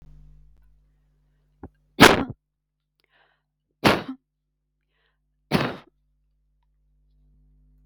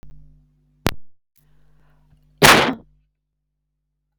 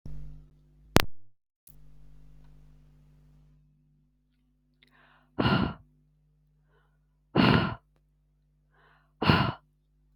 three_cough_length: 7.9 s
three_cough_amplitude: 32768
three_cough_signal_mean_std_ratio: 0.19
cough_length: 4.2 s
cough_amplitude: 32768
cough_signal_mean_std_ratio: 0.26
exhalation_length: 10.2 s
exhalation_amplitude: 32768
exhalation_signal_mean_std_ratio: 0.3
survey_phase: beta (2021-08-13 to 2022-03-07)
age: 45-64
gender: Female
wearing_mask: 'No'
symptom_fatigue: true
symptom_headache: true
symptom_onset: 8 days
smoker_status: Never smoked
respiratory_condition_asthma: false
respiratory_condition_other: false
recruitment_source: REACT
submission_delay: 2 days
covid_test_result: Negative
covid_test_method: RT-qPCR
influenza_a_test_result: Negative
influenza_b_test_result: Negative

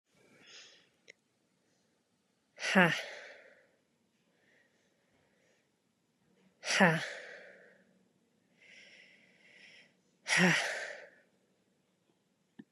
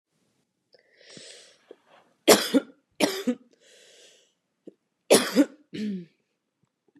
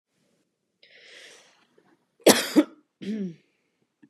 exhalation_length: 12.7 s
exhalation_amplitude: 12530
exhalation_signal_mean_std_ratio: 0.26
three_cough_length: 7.0 s
three_cough_amplitude: 27760
three_cough_signal_mean_std_ratio: 0.27
cough_length: 4.1 s
cough_amplitude: 31972
cough_signal_mean_std_ratio: 0.24
survey_phase: beta (2021-08-13 to 2022-03-07)
age: 18-44
gender: Female
wearing_mask: 'No'
symptom_runny_or_blocked_nose: true
symptom_sore_throat: true
symptom_fatigue: true
symptom_headache: true
symptom_onset: 2 days
smoker_status: Never smoked
respiratory_condition_asthma: false
respiratory_condition_other: false
recruitment_source: Test and Trace
submission_delay: 1 day
covid_test_result: Positive
covid_test_method: RT-qPCR
covid_ct_value: 15.1
covid_ct_gene: ORF1ab gene
covid_ct_mean: 15.5
covid_viral_load: 8100000 copies/ml
covid_viral_load_category: High viral load (>1M copies/ml)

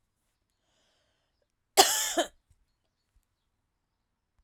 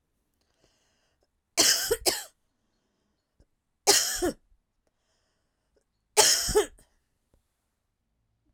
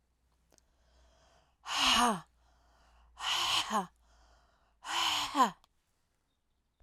cough_length: 4.4 s
cough_amplitude: 25505
cough_signal_mean_std_ratio: 0.21
three_cough_length: 8.5 s
three_cough_amplitude: 23936
three_cough_signal_mean_std_ratio: 0.3
exhalation_length: 6.8 s
exhalation_amplitude: 7615
exhalation_signal_mean_std_ratio: 0.41
survey_phase: beta (2021-08-13 to 2022-03-07)
age: 45-64
gender: Female
wearing_mask: 'No'
symptom_runny_or_blocked_nose: true
symptom_headache: true
symptom_change_to_sense_of_smell_or_taste: true
symptom_onset: 3 days
smoker_status: Never smoked
respiratory_condition_asthma: false
respiratory_condition_other: false
recruitment_source: Test and Trace
submission_delay: 2 days
covid_test_result: Positive
covid_test_method: ePCR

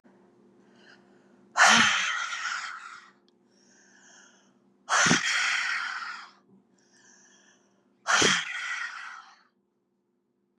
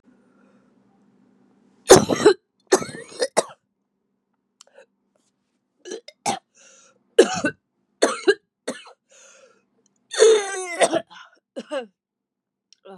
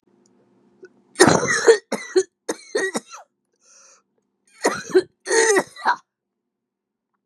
exhalation_length: 10.6 s
exhalation_amplitude: 17391
exhalation_signal_mean_std_ratio: 0.41
three_cough_length: 13.0 s
three_cough_amplitude: 32768
three_cough_signal_mean_std_ratio: 0.27
cough_length: 7.3 s
cough_amplitude: 32710
cough_signal_mean_std_ratio: 0.36
survey_phase: beta (2021-08-13 to 2022-03-07)
age: 45-64
gender: Female
wearing_mask: 'No'
symptom_cough_any: true
symptom_new_continuous_cough: true
symptom_runny_or_blocked_nose: true
symptom_sore_throat: true
symptom_abdominal_pain: true
symptom_diarrhoea: true
symptom_headache: true
smoker_status: Current smoker (1 to 10 cigarettes per day)
respiratory_condition_asthma: false
respiratory_condition_other: false
recruitment_source: Test and Trace
submission_delay: 1 day
covid_test_result: Positive
covid_test_method: LFT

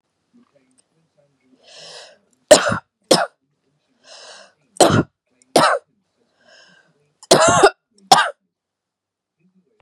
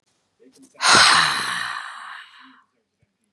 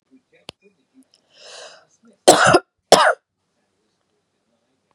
three_cough_length: 9.8 s
three_cough_amplitude: 32768
three_cough_signal_mean_std_ratio: 0.29
exhalation_length: 3.3 s
exhalation_amplitude: 28229
exhalation_signal_mean_std_ratio: 0.42
cough_length: 4.9 s
cough_amplitude: 32768
cough_signal_mean_std_ratio: 0.26
survey_phase: beta (2021-08-13 to 2022-03-07)
age: 45-64
gender: Female
wearing_mask: 'No'
symptom_none: true
smoker_status: Never smoked
respiratory_condition_asthma: false
respiratory_condition_other: false
recruitment_source: REACT
submission_delay: 3 days
covid_test_result: Negative
covid_test_method: RT-qPCR
influenza_a_test_result: Negative
influenza_b_test_result: Negative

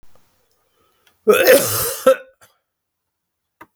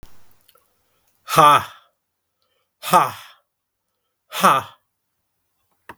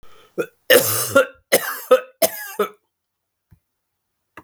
cough_length: 3.8 s
cough_amplitude: 32768
cough_signal_mean_std_ratio: 0.35
exhalation_length: 6.0 s
exhalation_amplitude: 32766
exhalation_signal_mean_std_ratio: 0.28
three_cough_length: 4.4 s
three_cough_amplitude: 32768
three_cough_signal_mean_std_ratio: 0.36
survey_phase: beta (2021-08-13 to 2022-03-07)
age: 45-64
gender: Male
wearing_mask: 'No'
symptom_cough_any: true
symptom_runny_or_blocked_nose: true
symptom_headache: true
smoker_status: Never smoked
respiratory_condition_asthma: false
respiratory_condition_other: false
recruitment_source: Test and Trace
submission_delay: 2 days
covid_test_result: Positive
covid_test_method: RT-qPCR
covid_ct_value: 19.6
covid_ct_gene: N gene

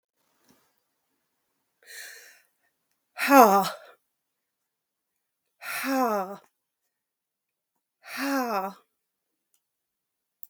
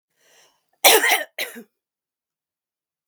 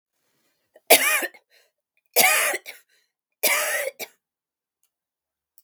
exhalation_length: 10.5 s
exhalation_amplitude: 31676
exhalation_signal_mean_std_ratio: 0.25
cough_length: 3.1 s
cough_amplitude: 32768
cough_signal_mean_std_ratio: 0.28
three_cough_length: 5.6 s
three_cough_amplitude: 32768
three_cough_signal_mean_std_ratio: 0.35
survey_phase: beta (2021-08-13 to 2022-03-07)
age: 65+
gender: Female
wearing_mask: 'No'
symptom_other: true
symptom_onset: 2 days
smoker_status: Ex-smoker
respiratory_condition_asthma: true
respiratory_condition_other: false
recruitment_source: REACT
submission_delay: 1 day
covid_test_result: Negative
covid_test_method: RT-qPCR
influenza_a_test_result: Negative
influenza_b_test_result: Negative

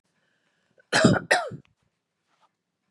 cough_length: 2.9 s
cough_amplitude: 18655
cough_signal_mean_std_ratio: 0.3
survey_phase: beta (2021-08-13 to 2022-03-07)
age: 45-64
gender: Female
wearing_mask: 'No'
symptom_cough_any: true
symptom_onset: 2 days
smoker_status: Never smoked
respiratory_condition_asthma: false
respiratory_condition_other: false
recruitment_source: Test and Trace
submission_delay: 1 day
covid_test_result: Negative
covid_test_method: RT-qPCR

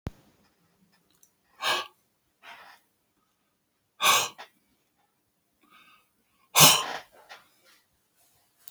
exhalation_length: 8.7 s
exhalation_amplitude: 31378
exhalation_signal_mean_std_ratio: 0.22
survey_phase: beta (2021-08-13 to 2022-03-07)
age: 45-64
gender: Male
wearing_mask: 'No'
symptom_other: true
smoker_status: Never smoked
respiratory_condition_asthma: false
respiratory_condition_other: false
recruitment_source: REACT
submission_delay: 2 days
covid_test_result: Negative
covid_test_method: RT-qPCR
influenza_a_test_result: Negative
influenza_b_test_result: Negative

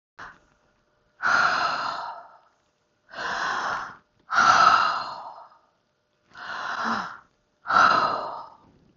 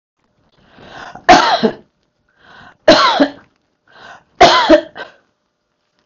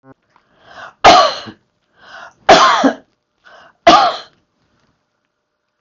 exhalation_length: 9.0 s
exhalation_amplitude: 22727
exhalation_signal_mean_std_ratio: 0.5
three_cough_length: 6.1 s
three_cough_amplitude: 32768
three_cough_signal_mean_std_ratio: 0.37
cough_length: 5.8 s
cough_amplitude: 32768
cough_signal_mean_std_ratio: 0.35
survey_phase: beta (2021-08-13 to 2022-03-07)
age: 45-64
gender: Female
wearing_mask: 'No'
symptom_none: true
smoker_status: Never smoked
respiratory_condition_asthma: false
respiratory_condition_other: false
recruitment_source: REACT
submission_delay: 1 day
covid_test_result: Negative
covid_test_method: RT-qPCR
influenza_a_test_result: Unknown/Void
influenza_b_test_result: Unknown/Void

